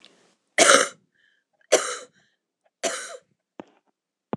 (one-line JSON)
{"three_cough_length": "4.4 s", "three_cough_amplitude": 26028, "three_cough_signal_mean_std_ratio": 0.28, "survey_phase": "alpha (2021-03-01 to 2021-08-12)", "age": "45-64", "gender": "Female", "wearing_mask": "No", "symptom_cough_any": true, "symptom_fatigue": true, "smoker_status": "Never smoked", "respiratory_condition_asthma": false, "respiratory_condition_other": true, "recruitment_source": "Test and Trace", "submission_delay": "1 day", "covid_test_result": "Positive", "covid_test_method": "RT-qPCR", "covid_ct_value": 33.2, "covid_ct_gene": "N gene"}